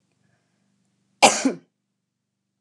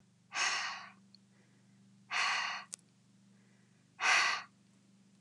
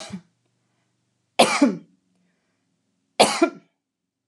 {"cough_length": "2.6 s", "cough_amplitude": 32396, "cough_signal_mean_std_ratio": 0.22, "exhalation_length": "5.2 s", "exhalation_amplitude": 5523, "exhalation_signal_mean_std_ratio": 0.43, "three_cough_length": "4.3 s", "three_cough_amplitude": 31460, "three_cough_signal_mean_std_ratio": 0.28, "survey_phase": "alpha (2021-03-01 to 2021-08-12)", "age": "65+", "gender": "Female", "wearing_mask": "No", "symptom_none": true, "smoker_status": "Never smoked", "respiratory_condition_asthma": false, "respiratory_condition_other": false, "recruitment_source": "REACT", "submission_delay": "2 days", "covid_test_result": "Negative", "covid_test_method": "RT-qPCR"}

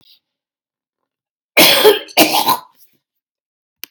{"cough_length": "3.9 s", "cough_amplitude": 32768, "cough_signal_mean_std_ratio": 0.36, "survey_phase": "beta (2021-08-13 to 2022-03-07)", "age": "65+", "gender": "Female", "wearing_mask": "No", "symptom_cough_any": true, "symptom_shortness_of_breath": true, "symptom_headache": true, "symptom_onset": "12 days", "smoker_status": "Never smoked", "respiratory_condition_asthma": false, "respiratory_condition_other": true, "recruitment_source": "REACT", "submission_delay": "1 day", "covid_test_result": "Negative", "covid_test_method": "RT-qPCR", "influenza_a_test_result": "Negative", "influenza_b_test_result": "Negative"}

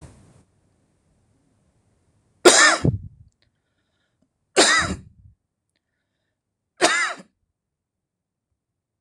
{"three_cough_length": "9.0 s", "three_cough_amplitude": 26028, "three_cough_signal_mean_std_ratio": 0.27, "survey_phase": "beta (2021-08-13 to 2022-03-07)", "age": "45-64", "gender": "Male", "wearing_mask": "No", "symptom_cough_any": true, "symptom_runny_or_blocked_nose": true, "symptom_sore_throat": true, "symptom_fatigue": true, "symptom_onset": "10 days", "smoker_status": "Never smoked", "respiratory_condition_asthma": false, "respiratory_condition_other": false, "recruitment_source": "REACT", "submission_delay": "10 days", "covid_test_result": "Negative", "covid_test_method": "RT-qPCR", "influenza_a_test_result": "Negative", "influenza_b_test_result": "Negative"}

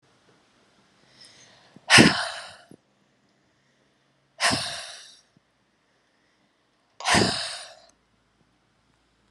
{"exhalation_length": "9.3 s", "exhalation_amplitude": 30889, "exhalation_signal_mean_std_ratio": 0.26, "survey_phase": "alpha (2021-03-01 to 2021-08-12)", "age": "18-44", "gender": "Female", "wearing_mask": "No", "symptom_none": true, "smoker_status": "Never smoked", "respiratory_condition_asthma": false, "respiratory_condition_other": false, "recruitment_source": "REACT", "submission_delay": "1 day", "covid_test_result": "Negative", "covid_test_method": "RT-qPCR"}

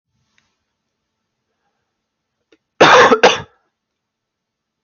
{"cough_length": "4.8 s", "cough_amplitude": 32768, "cough_signal_mean_std_ratio": 0.27, "survey_phase": "beta (2021-08-13 to 2022-03-07)", "age": "18-44", "gender": "Male", "wearing_mask": "No", "symptom_none": true, "smoker_status": "Never smoked", "respiratory_condition_asthma": false, "respiratory_condition_other": false, "recruitment_source": "REACT", "submission_delay": "3 days", "covid_test_result": "Negative", "covid_test_method": "RT-qPCR", "influenza_a_test_result": "Negative", "influenza_b_test_result": "Negative"}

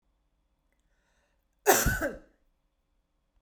{"cough_length": "3.4 s", "cough_amplitude": 15692, "cough_signal_mean_std_ratio": 0.26, "survey_phase": "beta (2021-08-13 to 2022-03-07)", "age": "18-44", "gender": "Female", "wearing_mask": "No", "symptom_none": true, "smoker_status": "Never smoked", "respiratory_condition_asthma": false, "respiratory_condition_other": false, "recruitment_source": "REACT", "submission_delay": "1 day", "covid_test_result": "Negative", "covid_test_method": "RT-qPCR"}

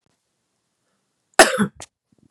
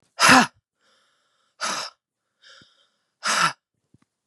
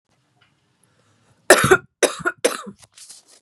{"cough_length": "2.3 s", "cough_amplitude": 32768, "cough_signal_mean_std_ratio": 0.22, "exhalation_length": "4.3 s", "exhalation_amplitude": 30171, "exhalation_signal_mean_std_ratio": 0.29, "three_cough_length": "3.4 s", "three_cough_amplitude": 32768, "three_cough_signal_mean_std_ratio": 0.28, "survey_phase": "beta (2021-08-13 to 2022-03-07)", "age": "18-44", "gender": "Female", "wearing_mask": "No", "symptom_none": true, "symptom_onset": "13 days", "smoker_status": "Current smoker (1 to 10 cigarettes per day)", "respiratory_condition_asthma": false, "respiratory_condition_other": false, "recruitment_source": "REACT", "submission_delay": "2 days", "covid_test_result": "Negative", "covid_test_method": "RT-qPCR", "influenza_a_test_result": "Negative", "influenza_b_test_result": "Negative"}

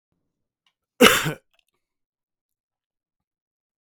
{"cough_length": "3.8 s", "cough_amplitude": 32767, "cough_signal_mean_std_ratio": 0.19, "survey_phase": "beta (2021-08-13 to 2022-03-07)", "age": "45-64", "gender": "Male", "wearing_mask": "No", "symptom_runny_or_blocked_nose": true, "smoker_status": "Never smoked", "respiratory_condition_asthma": false, "respiratory_condition_other": false, "recruitment_source": "Test and Trace", "submission_delay": "1 day", "covid_test_result": "Negative", "covid_test_method": "RT-qPCR"}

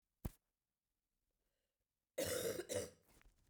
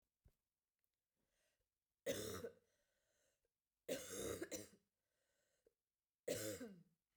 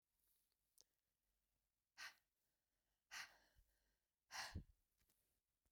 {"cough_length": "3.5 s", "cough_amplitude": 1243, "cough_signal_mean_std_ratio": 0.37, "three_cough_length": "7.2 s", "three_cough_amplitude": 888, "three_cough_signal_mean_std_ratio": 0.38, "exhalation_length": "5.7 s", "exhalation_amplitude": 351, "exhalation_signal_mean_std_ratio": 0.29, "survey_phase": "beta (2021-08-13 to 2022-03-07)", "age": "45-64", "gender": "Female", "wearing_mask": "No", "symptom_cough_any": true, "symptom_runny_or_blocked_nose": true, "symptom_fatigue": true, "symptom_headache": true, "symptom_change_to_sense_of_smell_or_taste": true, "smoker_status": "Never smoked", "respiratory_condition_asthma": false, "respiratory_condition_other": false, "recruitment_source": "Test and Trace", "submission_delay": "2 days", "covid_test_result": "Positive", "covid_test_method": "RT-qPCR", "covid_ct_value": 24.9, "covid_ct_gene": "ORF1ab gene", "covid_ct_mean": 25.8, "covid_viral_load": "3500 copies/ml", "covid_viral_load_category": "Minimal viral load (< 10K copies/ml)"}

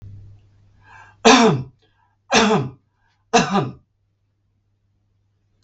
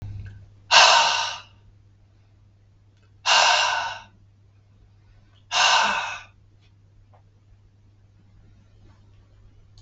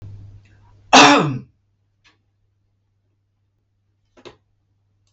{"three_cough_length": "5.6 s", "three_cough_amplitude": 32768, "three_cough_signal_mean_std_ratio": 0.34, "exhalation_length": "9.8 s", "exhalation_amplitude": 32768, "exhalation_signal_mean_std_ratio": 0.37, "cough_length": "5.1 s", "cough_amplitude": 32768, "cough_signal_mean_std_ratio": 0.23, "survey_phase": "beta (2021-08-13 to 2022-03-07)", "age": "65+", "gender": "Male", "wearing_mask": "No", "symptom_none": true, "smoker_status": "Ex-smoker", "respiratory_condition_asthma": false, "respiratory_condition_other": false, "recruitment_source": "REACT", "submission_delay": "2 days", "covid_test_result": "Negative", "covid_test_method": "RT-qPCR", "influenza_a_test_result": "Negative", "influenza_b_test_result": "Negative"}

